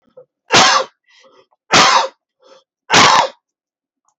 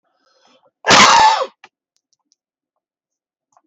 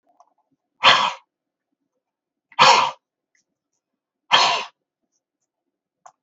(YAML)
three_cough_length: 4.2 s
three_cough_amplitude: 32768
three_cough_signal_mean_std_ratio: 0.43
cough_length: 3.7 s
cough_amplitude: 32768
cough_signal_mean_std_ratio: 0.33
exhalation_length: 6.2 s
exhalation_amplitude: 29360
exhalation_signal_mean_std_ratio: 0.29
survey_phase: beta (2021-08-13 to 2022-03-07)
age: 65+
gender: Male
wearing_mask: 'No'
symptom_none: true
smoker_status: Never smoked
respiratory_condition_asthma: false
respiratory_condition_other: false
recruitment_source: REACT
submission_delay: 2 days
covid_test_result: Negative
covid_test_method: RT-qPCR